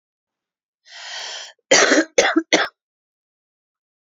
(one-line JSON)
{"three_cough_length": "4.0 s", "three_cough_amplitude": 30145, "three_cough_signal_mean_std_ratio": 0.35, "survey_phase": "beta (2021-08-13 to 2022-03-07)", "age": "45-64", "gender": "Female", "wearing_mask": "No", "symptom_fatigue": true, "symptom_headache": true, "symptom_change_to_sense_of_smell_or_taste": true, "smoker_status": "Never smoked", "respiratory_condition_asthma": false, "respiratory_condition_other": false, "recruitment_source": "REACT", "submission_delay": "1 day", "covid_test_result": "Negative", "covid_test_method": "RT-qPCR", "influenza_a_test_result": "Negative", "influenza_b_test_result": "Negative"}